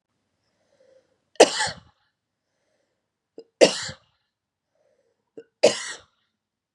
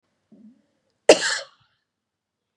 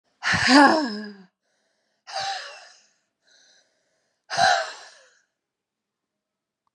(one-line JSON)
{"three_cough_length": "6.7 s", "three_cough_amplitude": 32384, "three_cough_signal_mean_std_ratio": 0.19, "cough_length": "2.6 s", "cough_amplitude": 32767, "cough_signal_mean_std_ratio": 0.19, "exhalation_length": "6.7 s", "exhalation_amplitude": 27452, "exhalation_signal_mean_std_ratio": 0.33, "survey_phase": "beta (2021-08-13 to 2022-03-07)", "age": "18-44", "gender": "Female", "wearing_mask": "No", "symptom_fatigue": true, "smoker_status": "Never smoked", "respiratory_condition_asthma": true, "respiratory_condition_other": false, "recruitment_source": "Test and Trace", "submission_delay": "1 day", "covid_test_result": "Positive", "covid_test_method": "RT-qPCR", "covid_ct_value": 31.6, "covid_ct_gene": "ORF1ab gene"}